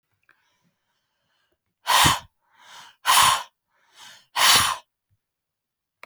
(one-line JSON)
{"exhalation_length": "6.1 s", "exhalation_amplitude": 29606, "exhalation_signal_mean_std_ratio": 0.34, "survey_phase": "beta (2021-08-13 to 2022-03-07)", "age": "45-64", "gender": "Female", "wearing_mask": "No", "symptom_cough_any": true, "symptom_runny_or_blocked_nose": true, "symptom_fatigue": true, "symptom_onset": "3 days", "smoker_status": "Never smoked", "respiratory_condition_asthma": false, "respiratory_condition_other": false, "recruitment_source": "Test and Trace", "submission_delay": "2 days", "covid_test_result": "Positive", "covid_test_method": "RT-qPCR", "covid_ct_value": 17.3, "covid_ct_gene": "ORF1ab gene", "covid_ct_mean": 18.4, "covid_viral_load": "960000 copies/ml", "covid_viral_load_category": "Low viral load (10K-1M copies/ml)"}